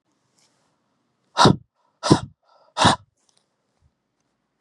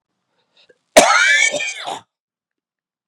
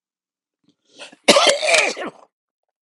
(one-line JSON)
{"exhalation_length": "4.6 s", "exhalation_amplitude": 32768, "exhalation_signal_mean_std_ratio": 0.24, "cough_length": "3.1 s", "cough_amplitude": 32768, "cough_signal_mean_std_ratio": 0.39, "three_cough_length": "2.8 s", "three_cough_amplitude": 32768, "three_cough_signal_mean_std_ratio": 0.38, "survey_phase": "beta (2021-08-13 to 2022-03-07)", "age": "45-64", "gender": "Male", "wearing_mask": "No", "symptom_cough_any": true, "symptom_runny_or_blocked_nose": true, "smoker_status": "Never smoked", "respiratory_condition_asthma": false, "respiratory_condition_other": false, "recruitment_source": "Test and Trace", "submission_delay": "1 day", "covid_test_result": "Positive", "covid_test_method": "RT-qPCR"}